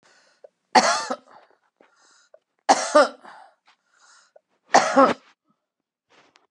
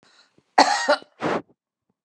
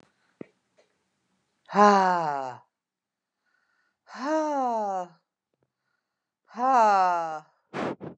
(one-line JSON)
{"three_cough_length": "6.5 s", "three_cough_amplitude": 28930, "three_cough_signal_mean_std_ratio": 0.29, "cough_length": "2.0 s", "cough_amplitude": 30810, "cough_signal_mean_std_ratio": 0.37, "exhalation_length": "8.2 s", "exhalation_amplitude": 16813, "exhalation_signal_mean_std_ratio": 0.42, "survey_phase": "beta (2021-08-13 to 2022-03-07)", "age": "45-64", "gender": "Female", "wearing_mask": "No", "symptom_none": true, "smoker_status": "Never smoked", "respiratory_condition_asthma": false, "respiratory_condition_other": false, "recruitment_source": "REACT", "submission_delay": "1 day", "covid_test_result": "Negative", "covid_test_method": "RT-qPCR", "influenza_a_test_result": "Negative", "influenza_b_test_result": "Negative"}